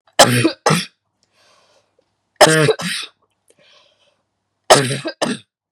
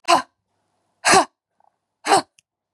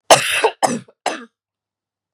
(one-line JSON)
{"three_cough_length": "5.7 s", "three_cough_amplitude": 32768, "three_cough_signal_mean_std_ratio": 0.36, "exhalation_length": "2.7 s", "exhalation_amplitude": 28043, "exhalation_signal_mean_std_ratio": 0.33, "cough_length": "2.1 s", "cough_amplitude": 32768, "cough_signal_mean_std_ratio": 0.37, "survey_phase": "beta (2021-08-13 to 2022-03-07)", "age": "18-44", "gender": "Female", "wearing_mask": "No", "symptom_shortness_of_breath": true, "symptom_fatigue": true, "symptom_headache": true, "smoker_status": "Ex-smoker", "respiratory_condition_asthma": true, "respiratory_condition_other": false, "recruitment_source": "REACT", "submission_delay": "1 day", "covid_test_result": "Negative", "covid_test_method": "RT-qPCR", "influenza_a_test_result": "Negative", "influenza_b_test_result": "Negative"}